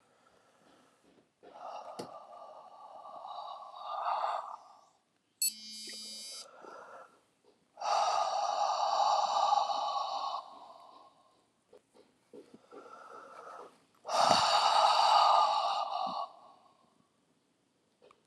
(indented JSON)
{
  "exhalation_length": "18.3 s",
  "exhalation_amplitude": 9241,
  "exhalation_signal_mean_std_ratio": 0.5,
  "survey_phase": "alpha (2021-03-01 to 2021-08-12)",
  "age": "65+",
  "gender": "Male",
  "wearing_mask": "No",
  "symptom_cough_any": true,
  "symptom_headache": true,
  "smoker_status": "Never smoked",
  "respiratory_condition_asthma": true,
  "respiratory_condition_other": false,
  "recruitment_source": "Test and Trace",
  "submission_delay": "2 days",
  "covid_test_result": "Positive",
  "covid_test_method": "RT-qPCR",
  "covid_ct_value": 20.6,
  "covid_ct_gene": "ORF1ab gene",
  "covid_ct_mean": 20.9,
  "covid_viral_load": "140000 copies/ml",
  "covid_viral_load_category": "Low viral load (10K-1M copies/ml)"
}